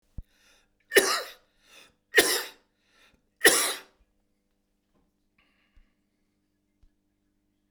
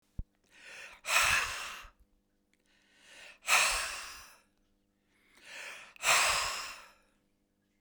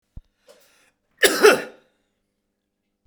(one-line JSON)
{"three_cough_length": "7.7 s", "three_cough_amplitude": 23604, "three_cough_signal_mean_std_ratio": 0.24, "exhalation_length": "7.8 s", "exhalation_amplitude": 9406, "exhalation_signal_mean_std_ratio": 0.41, "cough_length": "3.1 s", "cough_amplitude": 32767, "cough_signal_mean_std_ratio": 0.25, "survey_phase": "beta (2021-08-13 to 2022-03-07)", "age": "65+", "gender": "Male", "wearing_mask": "No", "symptom_none": true, "smoker_status": "Ex-smoker", "respiratory_condition_asthma": false, "respiratory_condition_other": false, "recruitment_source": "REACT", "submission_delay": "2 days", "covid_test_result": "Negative", "covid_test_method": "RT-qPCR", "influenza_a_test_result": "Negative", "influenza_b_test_result": "Negative"}